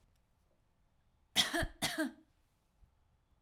{"cough_length": "3.4 s", "cough_amplitude": 5160, "cough_signal_mean_std_ratio": 0.32, "survey_phase": "alpha (2021-03-01 to 2021-08-12)", "age": "45-64", "gender": "Female", "wearing_mask": "No", "symptom_none": true, "smoker_status": "Ex-smoker", "respiratory_condition_asthma": false, "respiratory_condition_other": false, "recruitment_source": "REACT", "submission_delay": "2 days", "covid_test_result": "Negative", "covid_test_method": "RT-qPCR"}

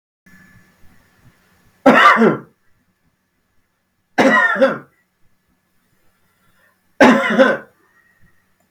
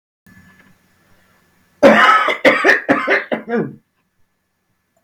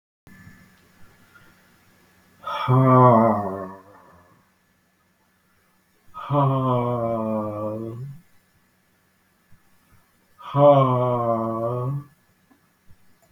{"three_cough_length": "8.7 s", "three_cough_amplitude": 32766, "three_cough_signal_mean_std_ratio": 0.35, "cough_length": "5.0 s", "cough_amplitude": 32768, "cough_signal_mean_std_ratio": 0.43, "exhalation_length": "13.3 s", "exhalation_amplitude": 27522, "exhalation_signal_mean_std_ratio": 0.43, "survey_phase": "beta (2021-08-13 to 2022-03-07)", "age": "45-64", "gender": "Male", "wearing_mask": "No", "symptom_none": true, "smoker_status": "Ex-smoker", "respiratory_condition_asthma": false, "respiratory_condition_other": false, "recruitment_source": "REACT", "submission_delay": "0 days", "covid_test_result": "Negative", "covid_test_method": "RT-qPCR", "influenza_a_test_result": "Negative", "influenza_b_test_result": "Negative"}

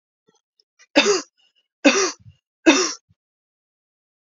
{"three_cough_length": "4.4 s", "three_cough_amplitude": 28300, "three_cough_signal_mean_std_ratio": 0.31, "survey_phase": "beta (2021-08-13 to 2022-03-07)", "age": "45-64", "gender": "Female", "wearing_mask": "No", "symptom_runny_or_blocked_nose": true, "symptom_sore_throat": true, "symptom_fatigue": true, "symptom_headache": true, "symptom_onset": "4 days", "smoker_status": "Ex-smoker", "respiratory_condition_asthma": false, "respiratory_condition_other": false, "recruitment_source": "Test and Trace", "submission_delay": "2 days", "covid_test_result": "Negative", "covid_test_method": "RT-qPCR"}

